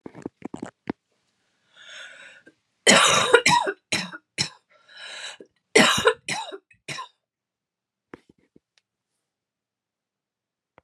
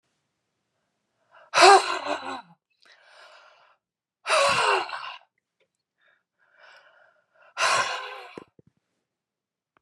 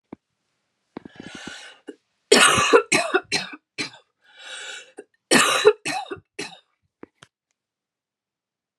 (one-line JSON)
{"three_cough_length": "10.8 s", "three_cough_amplitude": 30291, "three_cough_signal_mean_std_ratio": 0.3, "exhalation_length": "9.8 s", "exhalation_amplitude": 28602, "exhalation_signal_mean_std_ratio": 0.3, "cough_length": "8.8 s", "cough_amplitude": 32007, "cough_signal_mean_std_ratio": 0.33, "survey_phase": "beta (2021-08-13 to 2022-03-07)", "age": "45-64", "gender": "Female", "wearing_mask": "No", "symptom_none": true, "symptom_onset": "11 days", "smoker_status": "Never smoked", "respiratory_condition_asthma": true, "respiratory_condition_other": false, "recruitment_source": "REACT", "submission_delay": "2 days", "covid_test_result": "Negative", "covid_test_method": "RT-qPCR"}